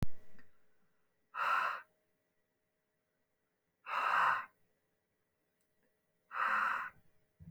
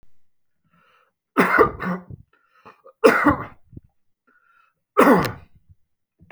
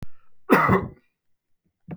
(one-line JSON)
{"exhalation_length": "7.5 s", "exhalation_amplitude": 3611, "exhalation_signal_mean_std_ratio": 0.42, "three_cough_length": "6.3 s", "three_cough_amplitude": 28149, "three_cough_signal_mean_std_ratio": 0.33, "cough_length": "2.0 s", "cough_amplitude": 25432, "cough_signal_mean_std_ratio": 0.41, "survey_phase": "beta (2021-08-13 to 2022-03-07)", "age": "45-64", "gender": "Male", "wearing_mask": "No", "symptom_runny_or_blocked_nose": true, "symptom_headache": true, "symptom_onset": "6 days", "smoker_status": "Never smoked", "respiratory_condition_asthma": false, "respiratory_condition_other": false, "recruitment_source": "REACT", "submission_delay": "2 days", "covid_test_result": "Negative", "covid_test_method": "RT-qPCR", "influenza_a_test_result": "Negative", "influenza_b_test_result": "Negative"}